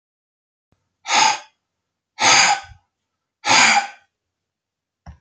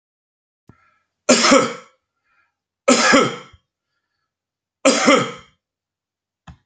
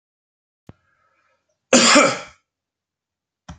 {
  "exhalation_length": "5.2 s",
  "exhalation_amplitude": 32381,
  "exhalation_signal_mean_std_ratio": 0.37,
  "three_cough_length": "6.7 s",
  "three_cough_amplitude": 32767,
  "three_cough_signal_mean_std_ratio": 0.35,
  "cough_length": "3.6 s",
  "cough_amplitude": 30376,
  "cough_signal_mean_std_ratio": 0.28,
  "survey_phase": "beta (2021-08-13 to 2022-03-07)",
  "age": "45-64",
  "gender": "Male",
  "wearing_mask": "No",
  "symptom_runny_or_blocked_nose": true,
  "symptom_onset": "2 days",
  "smoker_status": "Ex-smoker",
  "respiratory_condition_asthma": false,
  "respiratory_condition_other": false,
  "recruitment_source": "REACT",
  "submission_delay": "0 days",
  "covid_test_result": "Negative",
  "covid_test_method": "RT-qPCR",
  "influenza_a_test_result": "Unknown/Void",
  "influenza_b_test_result": "Unknown/Void"
}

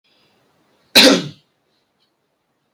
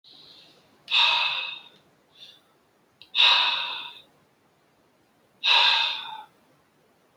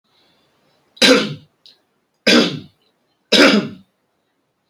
{
  "cough_length": "2.7 s",
  "cough_amplitude": 32768,
  "cough_signal_mean_std_ratio": 0.25,
  "exhalation_length": "7.2 s",
  "exhalation_amplitude": 16537,
  "exhalation_signal_mean_std_ratio": 0.42,
  "three_cough_length": "4.7 s",
  "three_cough_amplitude": 32229,
  "three_cough_signal_mean_std_ratio": 0.36,
  "survey_phase": "beta (2021-08-13 to 2022-03-07)",
  "age": "18-44",
  "gender": "Male",
  "wearing_mask": "No",
  "symptom_cough_any": true,
  "symptom_new_continuous_cough": true,
  "symptom_runny_or_blocked_nose": true,
  "symptom_sore_throat": true,
  "symptom_headache": true,
  "symptom_onset": "3 days",
  "smoker_status": "Never smoked",
  "respiratory_condition_asthma": true,
  "respiratory_condition_other": false,
  "recruitment_source": "REACT",
  "submission_delay": "1 day",
  "covid_test_result": "Negative",
  "covid_test_method": "RT-qPCR"
}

